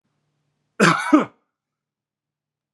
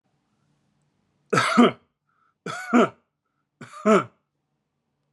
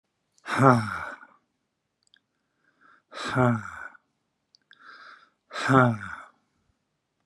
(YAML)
cough_length: 2.7 s
cough_amplitude: 27270
cough_signal_mean_std_ratio: 0.28
three_cough_length: 5.1 s
three_cough_amplitude: 21577
three_cough_signal_mean_std_ratio: 0.31
exhalation_length: 7.3 s
exhalation_amplitude: 26264
exhalation_signal_mean_std_ratio: 0.31
survey_phase: beta (2021-08-13 to 2022-03-07)
age: 45-64
gender: Male
wearing_mask: 'No'
symptom_none: true
smoker_status: Never smoked
respiratory_condition_asthma: false
respiratory_condition_other: false
recruitment_source: REACT
submission_delay: 2 days
covid_test_result: Negative
covid_test_method: RT-qPCR